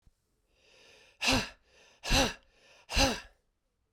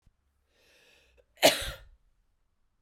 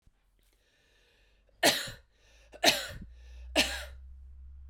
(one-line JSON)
{"exhalation_length": "3.9 s", "exhalation_amplitude": 8041, "exhalation_signal_mean_std_ratio": 0.36, "cough_length": "2.8 s", "cough_amplitude": 14669, "cough_signal_mean_std_ratio": 0.2, "three_cough_length": "4.7 s", "three_cough_amplitude": 14067, "three_cough_signal_mean_std_ratio": 0.34, "survey_phase": "beta (2021-08-13 to 2022-03-07)", "age": "45-64", "gender": "Female", "wearing_mask": "No", "symptom_runny_or_blocked_nose": true, "symptom_headache": true, "symptom_onset": "5 days", "smoker_status": "Never smoked", "respiratory_condition_asthma": false, "respiratory_condition_other": false, "recruitment_source": "Test and Trace", "submission_delay": "2 days", "covid_test_result": "Positive", "covid_test_method": "RT-qPCR"}